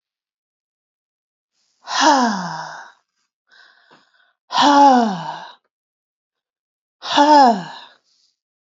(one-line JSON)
{"exhalation_length": "8.7 s", "exhalation_amplitude": 28739, "exhalation_signal_mean_std_ratio": 0.38, "survey_phase": "alpha (2021-03-01 to 2021-08-12)", "age": "65+", "gender": "Female", "wearing_mask": "No", "symptom_none": true, "smoker_status": "Never smoked", "respiratory_condition_asthma": false, "respiratory_condition_other": false, "recruitment_source": "REACT", "submission_delay": "3 days", "covid_test_result": "Negative", "covid_test_method": "RT-qPCR"}